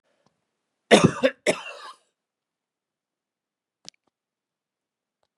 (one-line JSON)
{"cough_length": "5.4 s", "cough_amplitude": 28924, "cough_signal_mean_std_ratio": 0.19, "survey_phase": "beta (2021-08-13 to 2022-03-07)", "age": "65+", "gender": "Male", "wearing_mask": "No", "symptom_cough_any": true, "symptom_runny_or_blocked_nose": true, "smoker_status": "Ex-smoker", "respiratory_condition_asthma": false, "respiratory_condition_other": false, "recruitment_source": "REACT", "submission_delay": "1 day", "covid_test_result": "Negative", "covid_test_method": "RT-qPCR", "influenza_a_test_result": "Negative", "influenza_b_test_result": "Negative"}